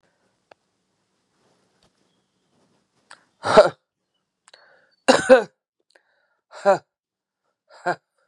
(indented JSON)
{
  "exhalation_length": "8.3 s",
  "exhalation_amplitude": 32767,
  "exhalation_signal_mean_std_ratio": 0.2,
  "survey_phase": "beta (2021-08-13 to 2022-03-07)",
  "age": "45-64",
  "gender": "Female",
  "wearing_mask": "No",
  "symptom_cough_any": true,
  "symptom_runny_or_blocked_nose": true,
  "symptom_shortness_of_breath": true,
  "symptom_sore_throat": true,
  "symptom_fatigue": true,
  "symptom_headache": true,
  "symptom_onset": "3 days",
  "smoker_status": "Never smoked",
  "respiratory_condition_asthma": false,
  "respiratory_condition_other": false,
  "recruitment_source": "Test and Trace",
  "submission_delay": "2 days",
  "covid_test_result": "Positive",
  "covid_test_method": "RT-qPCR",
  "covid_ct_value": 28.8,
  "covid_ct_gene": "ORF1ab gene",
  "covid_ct_mean": 31.5,
  "covid_viral_load": "46 copies/ml",
  "covid_viral_load_category": "Minimal viral load (< 10K copies/ml)"
}